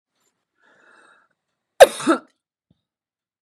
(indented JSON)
{
  "cough_length": "3.4 s",
  "cough_amplitude": 32768,
  "cough_signal_mean_std_ratio": 0.16,
  "survey_phase": "beta (2021-08-13 to 2022-03-07)",
  "age": "45-64",
  "gender": "Female",
  "wearing_mask": "No",
  "symptom_cough_any": true,
  "symptom_change_to_sense_of_smell_or_taste": true,
  "symptom_loss_of_taste": true,
  "smoker_status": "Ex-smoker",
  "respiratory_condition_asthma": false,
  "respiratory_condition_other": false,
  "recruitment_source": "Test and Trace",
  "submission_delay": "2 days",
  "covid_test_result": "Positive",
  "covid_test_method": "RT-qPCR"
}